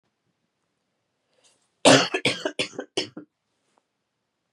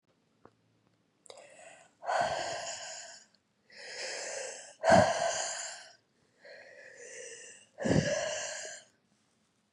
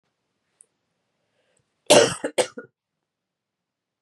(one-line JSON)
{"three_cough_length": "4.5 s", "three_cough_amplitude": 27042, "three_cough_signal_mean_std_ratio": 0.25, "exhalation_length": "9.7 s", "exhalation_amplitude": 9704, "exhalation_signal_mean_std_ratio": 0.42, "cough_length": "4.0 s", "cough_amplitude": 31232, "cough_signal_mean_std_ratio": 0.21, "survey_phase": "beta (2021-08-13 to 2022-03-07)", "age": "18-44", "gender": "Female", "wearing_mask": "No", "symptom_cough_any": true, "symptom_new_continuous_cough": true, "symptom_runny_or_blocked_nose": true, "symptom_shortness_of_breath": true, "symptom_sore_throat": true, "symptom_abdominal_pain": true, "symptom_fatigue": true, "symptom_fever_high_temperature": true, "symptom_headache": true, "symptom_other": true, "symptom_onset": "3 days", "smoker_status": "Never smoked", "respiratory_condition_asthma": false, "respiratory_condition_other": false, "recruitment_source": "Test and Trace", "submission_delay": "1 day", "covid_test_result": "Positive", "covid_test_method": "RT-qPCR", "covid_ct_value": 21.8, "covid_ct_gene": "N gene"}